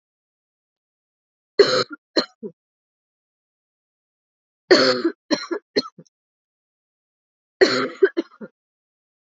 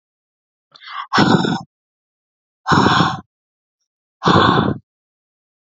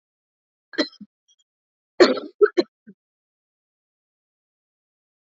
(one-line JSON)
{"three_cough_length": "9.3 s", "three_cough_amplitude": 27588, "three_cough_signal_mean_std_ratio": 0.27, "exhalation_length": "5.6 s", "exhalation_amplitude": 32768, "exhalation_signal_mean_std_ratio": 0.42, "cough_length": "5.2 s", "cough_amplitude": 27579, "cough_signal_mean_std_ratio": 0.19, "survey_phase": "alpha (2021-03-01 to 2021-08-12)", "age": "18-44", "gender": "Female", "wearing_mask": "No", "symptom_new_continuous_cough": true, "symptom_fatigue": true, "symptom_onset": "3 days", "smoker_status": "Never smoked", "respiratory_condition_asthma": false, "respiratory_condition_other": false, "recruitment_source": "Test and Trace", "submission_delay": "2 days", "covid_test_result": "Positive", "covid_test_method": "RT-qPCR"}